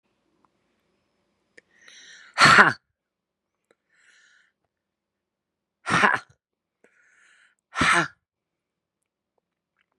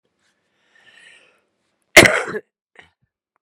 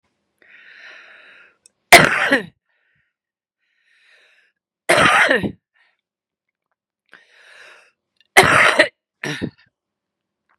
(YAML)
exhalation_length: 10.0 s
exhalation_amplitude: 32767
exhalation_signal_mean_std_ratio: 0.22
cough_length: 3.4 s
cough_amplitude: 32768
cough_signal_mean_std_ratio: 0.2
three_cough_length: 10.6 s
three_cough_amplitude: 32768
three_cough_signal_mean_std_ratio: 0.29
survey_phase: beta (2021-08-13 to 2022-03-07)
age: 45-64
gender: Female
wearing_mask: 'No'
symptom_runny_or_blocked_nose: true
symptom_sore_throat: true
symptom_diarrhoea: true
symptom_headache: true
symptom_onset: 2 days
smoker_status: Current smoker (1 to 10 cigarettes per day)
respiratory_condition_asthma: true
respiratory_condition_other: false
recruitment_source: Test and Trace
submission_delay: 2 days
covid_test_result: Positive
covid_test_method: RT-qPCR
covid_ct_value: 23.2
covid_ct_gene: ORF1ab gene
covid_ct_mean: 23.7
covid_viral_load: 16000 copies/ml
covid_viral_load_category: Low viral load (10K-1M copies/ml)